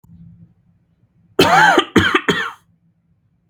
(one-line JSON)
{"three_cough_length": "3.5 s", "three_cough_amplitude": 32768, "three_cough_signal_mean_std_ratio": 0.41, "survey_phase": "beta (2021-08-13 to 2022-03-07)", "age": "18-44", "gender": "Male", "wearing_mask": "Yes", "symptom_none": true, "smoker_status": "Never smoked", "respiratory_condition_asthma": false, "respiratory_condition_other": false, "recruitment_source": "REACT", "submission_delay": "0 days", "covid_test_result": "Negative", "covid_test_method": "RT-qPCR", "influenza_a_test_result": "Negative", "influenza_b_test_result": "Negative"}